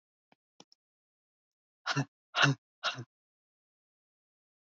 {"exhalation_length": "4.7 s", "exhalation_amplitude": 9172, "exhalation_signal_mean_std_ratio": 0.23, "survey_phase": "beta (2021-08-13 to 2022-03-07)", "age": "45-64", "gender": "Female", "wearing_mask": "No", "symptom_none": true, "smoker_status": "Current smoker (1 to 10 cigarettes per day)", "respiratory_condition_asthma": false, "respiratory_condition_other": false, "recruitment_source": "REACT", "submission_delay": "1 day", "covid_test_result": "Negative", "covid_test_method": "RT-qPCR"}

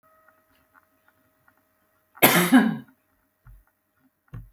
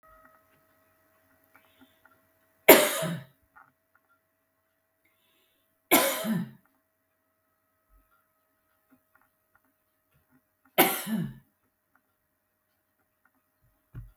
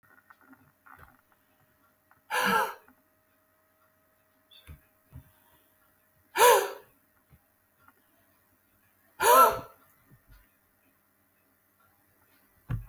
{"cough_length": "4.5 s", "cough_amplitude": 27894, "cough_signal_mean_std_ratio": 0.27, "three_cough_length": "14.2 s", "three_cough_amplitude": 32766, "three_cough_signal_mean_std_ratio": 0.2, "exhalation_length": "12.9 s", "exhalation_amplitude": 13772, "exhalation_signal_mean_std_ratio": 0.24, "survey_phase": "beta (2021-08-13 to 2022-03-07)", "age": "65+", "gender": "Female", "wearing_mask": "No", "symptom_none": true, "smoker_status": "Never smoked", "respiratory_condition_asthma": false, "respiratory_condition_other": false, "recruitment_source": "REACT", "submission_delay": "1 day", "covid_test_result": "Negative", "covid_test_method": "RT-qPCR"}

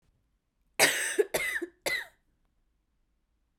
{"cough_length": "3.6 s", "cough_amplitude": 13453, "cough_signal_mean_std_ratio": 0.37, "survey_phase": "beta (2021-08-13 to 2022-03-07)", "age": "18-44", "gender": "Female", "wearing_mask": "No", "symptom_cough_any": true, "symptom_runny_or_blocked_nose": true, "symptom_shortness_of_breath": true, "symptom_sore_throat": true, "symptom_diarrhoea": true, "symptom_fatigue": true, "symptom_change_to_sense_of_smell_or_taste": true, "symptom_loss_of_taste": true, "symptom_other": true, "symptom_onset": "4 days", "smoker_status": "Never smoked", "respiratory_condition_asthma": false, "respiratory_condition_other": false, "recruitment_source": "Test and Trace", "submission_delay": "1 day", "covid_test_result": "Positive", "covid_test_method": "RT-qPCR", "covid_ct_value": 15.3, "covid_ct_gene": "N gene", "covid_ct_mean": 16.5, "covid_viral_load": "3800000 copies/ml", "covid_viral_load_category": "High viral load (>1M copies/ml)"}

